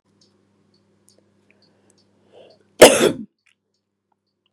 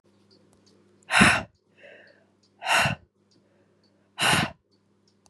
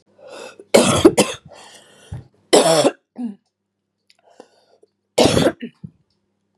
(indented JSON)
{
  "cough_length": "4.5 s",
  "cough_amplitude": 32768,
  "cough_signal_mean_std_ratio": 0.19,
  "exhalation_length": "5.3 s",
  "exhalation_amplitude": 26972,
  "exhalation_signal_mean_std_ratio": 0.33,
  "three_cough_length": "6.6 s",
  "three_cough_amplitude": 32768,
  "three_cough_signal_mean_std_ratio": 0.35,
  "survey_phase": "beta (2021-08-13 to 2022-03-07)",
  "age": "45-64",
  "gender": "Female",
  "wearing_mask": "No",
  "symptom_runny_or_blocked_nose": true,
  "symptom_fatigue": true,
  "symptom_headache": true,
  "symptom_change_to_sense_of_smell_or_taste": true,
  "symptom_onset": "2 days",
  "smoker_status": "Ex-smoker",
  "respiratory_condition_asthma": true,
  "respiratory_condition_other": false,
  "recruitment_source": "Test and Trace",
  "submission_delay": "2 days",
  "covid_test_result": "Positive",
  "covid_test_method": "RT-qPCR",
  "covid_ct_value": 24.1,
  "covid_ct_gene": "ORF1ab gene",
  "covid_ct_mean": 24.4,
  "covid_viral_load": "9700 copies/ml",
  "covid_viral_load_category": "Minimal viral load (< 10K copies/ml)"
}